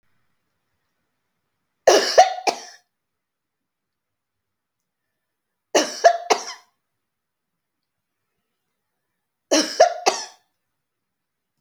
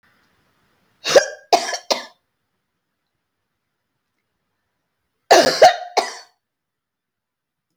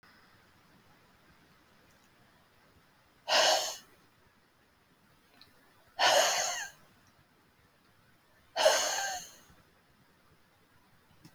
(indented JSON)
{
  "three_cough_length": "11.6 s",
  "three_cough_amplitude": 32767,
  "three_cough_signal_mean_std_ratio": 0.24,
  "cough_length": "7.8 s",
  "cough_amplitude": 30481,
  "cough_signal_mean_std_ratio": 0.25,
  "exhalation_length": "11.3 s",
  "exhalation_amplitude": 8504,
  "exhalation_signal_mean_std_ratio": 0.32,
  "survey_phase": "alpha (2021-03-01 to 2021-08-12)",
  "age": "65+",
  "gender": "Female",
  "wearing_mask": "No",
  "symptom_fatigue": true,
  "smoker_status": "Ex-smoker",
  "respiratory_condition_asthma": true,
  "respiratory_condition_other": false,
  "recruitment_source": "REACT",
  "submission_delay": "11 days",
  "covid_test_result": "Negative",
  "covid_test_method": "RT-qPCR"
}